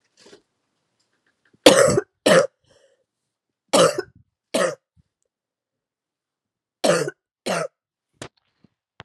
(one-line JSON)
{"three_cough_length": "9.0 s", "three_cough_amplitude": 32768, "three_cough_signal_mean_std_ratio": 0.29, "survey_phase": "alpha (2021-03-01 to 2021-08-12)", "age": "18-44", "gender": "Female", "wearing_mask": "No", "symptom_cough_any": true, "symptom_new_continuous_cough": true, "symptom_headache": true, "symptom_onset": "3 days", "smoker_status": "Never smoked", "respiratory_condition_asthma": false, "respiratory_condition_other": false, "recruitment_source": "Test and Trace", "submission_delay": "2 days", "covid_test_result": "Positive", "covid_test_method": "RT-qPCR"}